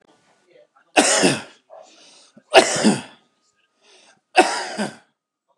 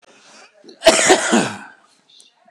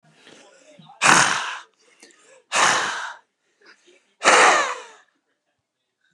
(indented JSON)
{
  "three_cough_length": "5.6 s",
  "three_cough_amplitude": 29204,
  "three_cough_signal_mean_std_ratio": 0.35,
  "cough_length": "2.5 s",
  "cough_amplitude": 29204,
  "cough_signal_mean_std_ratio": 0.4,
  "exhalation_length": "6.1 s",
  "exhalation_amplitude": 29204,
  "exhalation_signal_mean_std_ratio": 0.39,
  "survey_phase": "beta (2021-08-13 to 2022-03-07)",
  "age": "45-64",
  "gender": "Male",
  "wearing_mask": "No",
  "symptom_none": true,
  "smoker_status": "Current smoker (11 or more cigarettes per day)",
  "respiratory_condition_asthma": true,
  "respiratory_condition_other": false,
  "recruitment_source": "REACT",
  "submission_delay": "2 days",
  "covid_test_result": "Negative",
  "covid_test_method": "RT-qPCR",
  "influenza_a_test_result": "Negative",
  "influenza_b_test_result": "Negative"
}